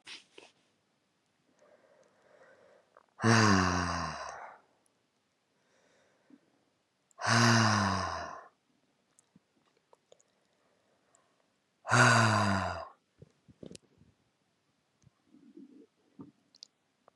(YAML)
exhalation_length: 17.2 s
exhalation_amplitude: 10327
exhalation_signal_mean_std_ratio: 0.32
survey_phase: beta (2021-08-13 to 2022-03-07)
age: 45-64
gender: Female
wearing_mask: 'No'
symptom_cough_any: true
symptom_runny_or_blocked_nose: true
symptom_sore_throat: true
symptom_fever_high_temperature: true
symptom_headache: true
symptom_other: true
symptom_onset: 4 days
smoker_status: Current smoker (1 to 10 cigarettes per day)
respiratory_condition_asthma: false
respiratory_condition_other: false
recruitment_source: Test and Trace
submission_delay: 1 day
covid_test_result: Positive
covid_test_method: RT-qPCR
covid_ct_value: 21.8
covid_ct_gene: ORF1ab gene
covid_ct_mean: 22.5
covid_viral_load: 43000 copies/ml
covid_viral_load_category: Low viral load (10K-1M copies/ml)